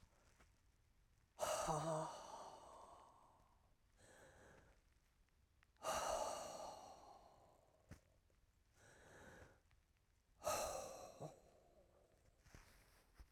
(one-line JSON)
{"exhalation_length": "13.3 s", "exhalation_amplitude": 1021, "exhalation_signal_mean_std_ratio": 0.44, "survey_phase": "alpha (2021-03-01 to 2021-08-12)", "age": "65+", "gender": "Female", "wearing_mask": "No", "symptom_cough_any": true, "symptom_new_continuous_cough": true, "symptom_fatigue": true, "symptom_headache": true, "smoker_status": "Never smoked", "respiratory_condition_asthma": true, "respiratory_condition_other": false, "recruitment_source": "Test and Trace", "submission_delay": "2 days", "covid_test_result": "Positive", "covid_test_method": "RT-qPCR"}